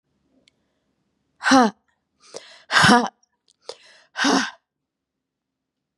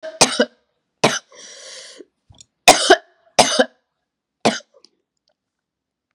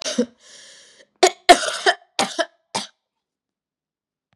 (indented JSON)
{
  "exhalation_length": "6.0 s",
  "exhalation_amplitude": 31873,
  "exhalation_signal_mean_std_ratio": 0.3,
  "three_cough_length": "6.1 s",
  "three_cough_amplitude": 32768,
  "three_cough_signal_mean_std_ratio": 0.28,
  "cough_length": "4.4 s",
  "cough_amplitude": 32768,
  "cough_signal_mean_std_ratio": 0.28,
  "survey_phase": "beta (2021-08-13 to 2022-03-07)",
  "age": "18-44",
  "gender": "Female",
  "wearing_mask": "No",
  "symptom_cough_any": true,
  "symptom_runny_or_blocked_nose": true,
  "symptom_shortness_of_breath": true,
  "symptom_fatigue": true,
  "smoker_status": "Ex-smoker",
  "respiratory_condition_asthma": true,
  "respiratory_condition_other": false,
  "recruitment_source": "Test and Trace",
  "submission_delay": "-17 days",
  "covid_test_result": "Negative",
  "covid_test_method": "LFT"
}